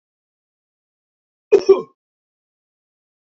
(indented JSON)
{
  "cough_length": "3.2 s",
  "cough_amplitude": 27447,
  "cough_signal_mean_std_ratio": 0.18,
  "survey_phase": "beta (2021-08-13 to 2022-03-07)",
  "age": "18-44",
  "gender": "Male",
  "wearing_mask": "Yes",
  "symptom_cough_any": true,
  "symptom_runny_or_blocked_nose": true,
  "smoker_status": "Never smoked",
  "respiratory_condition_asthma": false,
  "respiratory_condition_other": false,
  "recruitment_source": "Test and Trace",
  "submission_delay": "2 days",
  "covid_test_result": "Positive",
  "covid_test_method": "RT-qPCR",
  "covid_ct_value": 18.9,
  "covid_ct_gene": "ORF1ab gene",
  "covid_ct_mean": 19.4,
  "covid_viral_load": "420000 copies/ml",
  "covid_viral_load_category": "Low viral load (10K-1M copies/ml)"
}